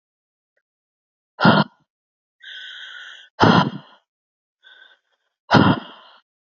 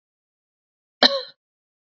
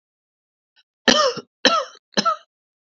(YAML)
exhalation_length: 6.6 s
exhalation_amplitude: 27671
exhalation_signal_mean_std_ratio: 0.29
cough_length: 2.0 s
cough_amplitude: 29887
cough_signal_mean_std_ratio: 0.19
three_cough_length: 2.8 s
three_cough_amplitude: 32768
three_cough_signal_mean_std_ratio: 0.36
survey_phase: beta (2021-08-13 to 2022-03-07)
age: 18-44
gender: Male
wearing_mask: 'No'
symptom_cough_any: true
symptom_runny_or_blocked_nose: true
symptom_sore_throat: true
symptom_onset: 12 days
smoker_status: Never smoked
respiratory_condition_asthma: false
respiratory_condition_other: false
recruitment_source: REACT
submission_delay: 2 days
covid_test_result: Negative
covid_test_method: RT-qPCR